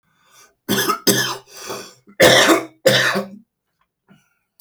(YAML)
cough_length: 4.6 s
cough_amplitude: 32767
cough_signal_mean_std_ratio: 0.45
survey_phase: alpha (2021-03-01 to 2021-08-12)
age: 45-64
gender: Male
wearing_mask: 'No'
symptom_none: true
smoker_status: Current smoker (11 or more cigarettes per day)
respiratory_condition_asthma: false
respiratory_condition_other: false
recruitment_source: REACT
submission_delay: 1 day
covid_test_result: Negative
covid_test_method: RT-qPCR